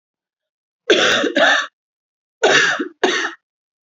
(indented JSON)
{
  "three_cough_length": "3.8 s",
  "three_cough_amplitude": 28629,
  "three_cough_signal_mean_std_ratio": 0.51,
  "survey_phase": "beta (2021-08-13 to 2022-03-07)",
  "age": "18-44",
  "gender": "Female",
  "wearing_mask": "No",
  "symptom_cough_any": true,
  "symptom_new_continuous_cough": true,
  "symptom_runny_or_blocked_nose": true,
  "symptom_shortness_of_breath": true,
  "symptom_sore_throat": true,
  "symptom_abdominal_pain": true,
  "symptom_fatigue": true,
  "symptom_fever_high_temperature": true,
  "symptom_onset": "5 days",
  "smoker_status": "Never smoked",
  "respiratory_condition_asthma": true,
  "respiratory_condition_other": false,
  "recruitment_source": "Test and Trace",
  "submission_delay": "2 days",
  "covid_test_result": "Positive",
  "covid_test_method": "RT-qPCR",
  "covid_ct_value": 14.7,
  "covid_ct_gene": "ORF1ab gene",
  "covid_ct_mean": 15.7,
  "covid_viral_load": "6900000 copies/ml",
  "covid_viral_load_category": "High viral load (>1M copies/ml)"
}